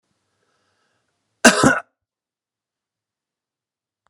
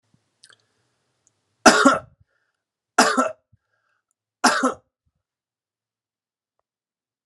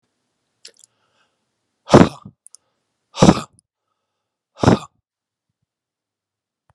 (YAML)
cough_length: 4.1 s
cough_amplitude: 32768
cough_signal_mean_std_ratio: 0.2
three_cough_length: 7.3 s
three_cough_amplitude: 32767
three_cough_signal_mean_std_ratio: 0.25
exhalation_length: 6.7 s
exhalation_amplitude: 32768
exhalation_signal_mean_std_ratio: 0.19
survey_phase: beta (2021-08-13 to 2022-03-07)
age: 45-64
gender: Male
wearing_mask: 'No'
symptom_cough_any: true
symptom_fatigue: true
smoker_status: Ex-smoker
respiratory_condition_asthma: false
respiratory_condition_other: false
recruitment_source: Test and Trace
submission_delay: 3 days
covid_test_result: Positive
covid_test_method: RT-qPCR
covid_ct_value: 18.7
covid_ct_gene: N gene